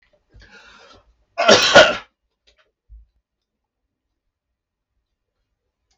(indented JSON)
{
  "cough_length": "6.0 s",
  "cough_amplitude": 32768,
  "cough_signal_mean_std_ratio": 0.23,
  "survey_phase": "beta (2021-08-13 to 2022-03-07)",
  "age": "45-64",
  "gender": "Male",
  "wearing_mask": "No",
  "symptom_cough_any": true,
  "symptom_runny_or_blocked_nose": true,
  "smoker_status": "Never smoked",
  "respiratory_condition_asthma": false,
  "respiratory_condition_other": false,
  "recruitment_source": "REACT",
  "submission_delay": "3 days",
  "covid_test_result": "Negative",
  "covid_test_method": "RT-qPCR"
}